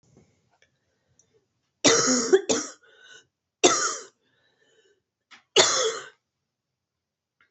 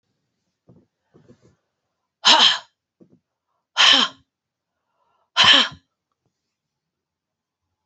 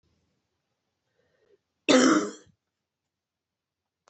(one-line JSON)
{"three_cough_length": "7.5 s", "three_cough_amplitude": 24786, "three_cough_signal_mean_std_ratio": 0.33, "exhalation_length": "7.9 s", "exhalation_amplitude": 30263, "exhalation_signal_mean_std_ratio": 0.27, "cough_length": "4.1 s", "cough_amplitude": 18352, "cough_signal_mean_std_ratio": 0.25, "survey_phase": "beta (2021-08-13 to 2022-03-07)", "age": "45-64", "gender": "Female", "wearing_mask": "No", "symptom_cough_any": true, "symptom_runny_or_blocked_nose": true, "symptom_fatigue": true, "symptom_fever_high_temperature": true, "symptom_onset": "4 days", "smoker_status": "Never smoked", "respiratory_condition_asthma": true, "respiratory_condition_other": false, "recruitment_source": "Test and Trace", "submission_delay": "1 day", "covid_test_result": "Positive", "covid_test_method": "RT-qPCR", "covid_ct_value": 17.0, "covid_ct_gene": "ORF1ab gene", "covid_ct_mean": 17.3, "covid_viral_load": "2100000 copies/ml", "covid_viral_load_category": "High viral load (>1M copies/ml)"}